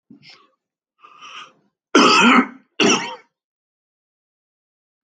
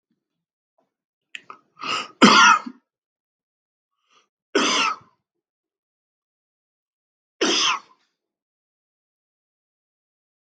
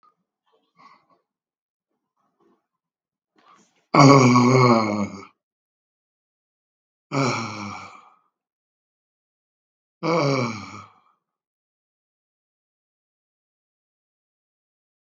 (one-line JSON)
{"cough_length": "5.0 s", "cough_amplitude": 32768, "cough_signal_mean_std_ratio": 0.33, "three_cough_length": "10.6 s", "three_cough_amplitude": 32768, "three_cough_signal_mean_std_ratio": 0.26, "exhalation_length": "15.1 s", "exhalation_amplitude": 32768, "exhalation_signal_mean_std_ratio": 0.27, "survey_phase": "beta (2021-08-13 to 2022-03-07)", "age": "45-64", "gender": "Male", "wearing_mask": "No", "symptom_cough_any": true, "symptom_shortness_of_breath": true, "smoker_status": "Ex-smoker", "respiratory_condition_asthma": false, "respiratory_condition_other": true, "recruitment_source": "REACT", "submission_delay": "1 day", "covid_test_result": "Negative", "covid_test_method": "RT-qPCR", "influenza_a_test_result": "Unknown/Void", "influenza_b_test_result": "Unknown/Void"}